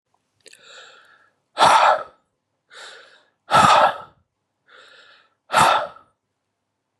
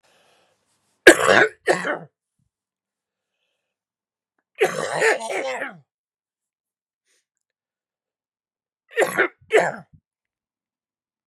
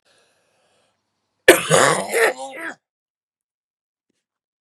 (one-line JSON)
{"exhalation_length": "7.0 s", "exhalation_amplitude": 32490, "exhalation_signal_mean_std_ratio": 0.35, "three_cough_length": "11.3 s", "three_cough_amplitude": 32768, "three_cough_signal_mean_std_ratio": 0.27, "cough_length": "4.6 s", "cough_amplitude": 32768, "cough_signal_mean_std_ratio": 0.3, "survey_phase": "beta (2021-08-13 to 2022-03-07)", "age": "45-64", "gender": "Male", "wearing_mask": "No", "symptom_cough_any": true, "symptom_new_continuous_cough": true, "symptom_fatigue": true, "symptom_fever_high_temperature": true, "symptom_headache": true, "symptom_onset": "3 days", "smoker_status": "Never smoked", "respiratory_condition_asthma": false, "respiratory_condition_other": false, "recruitment_source": "Test and Trace", "submission_delay": "2 days", "covid_test_result": "Positive", "covid_test_method": "RT-qPCR", "covid_ct_value": 20.4, "covid_ct_gene": "ORF1ab gene", "covid_ct_mean": 20.7, "covid_viral_load": "160000 copies/ml", "covid_viral_load_category": "Low viral load (10K-1M copies/ml)"}